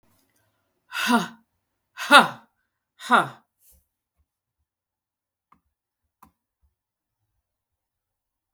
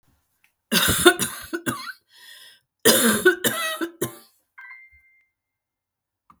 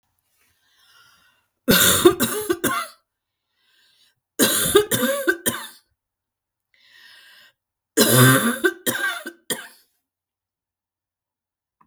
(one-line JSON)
{"exhalation_length": "8.5 s", "exhalation_amplitude": 32768, "exhalation_signal_mean_std_ratio": 0.2, "cough_length": "6.4 s", "cough_amplitude": 32768, "cough_signal_mean_std_ratio": 0.39, "three_cough_length": "11.9 s", "three_cough_amplitude": 32768, "three_cough_signal_mean_std_ratio": 0.38, "survey_phase": "beta (2021-08-13 to 2022-03-07)", "age": "45-64", "gender": "Female", "wearing_mask": "Yes", "symptom_sore_throat": true, "symptom_fatigue": true, "symptom_onset": "2 days", "smoker_status": "Never smoked", "respiratory_condition_asthma": false, "respiratory_condition_other": false, "recruitment_source": "Test and Trace", "submission_delay": "1 day", "covid_test_result": "Positive", "covid_test_method": "RT-qPCR", "covid_ct_value": 15.6, "covid_ct_gene": "ORF1ab gene"}